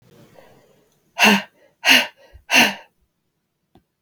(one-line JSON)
{"exhalation_length": "4.0 s", "exhalation_amplitude": 32766, "exhalation_signal_mean_std_ratio": 0.32, "survey_phase": "beta (2021-08-13 to 2022-03-07)", "age": "18-44", "gender": "Female", "wearing_mask": "No", "symptom_runny_or_blocked_nose": true, "symptom_shortness_of_breath": true, "symptom_fatigue": true, "symptom_headache": true, "symptom_onset": "2 days", "smoker_status": "Never smoked", "respiratory_condition_asthma": true, "respiratory_condition_other": false, "recruitment_source": "Test and Trace", "submission_delay": "1 day", "covid_test_result": "Positive", "covid_test_method": "RT-qPCR", "covid_ct_value": 15.8, "covid_ct_gene": "ORF1ab gene", "covid_ct_mean": 16.0, "covid_viral_load": "5700000 copies/ml", "covid_viral_load_category": "High viral load (>1M copies/ml)"}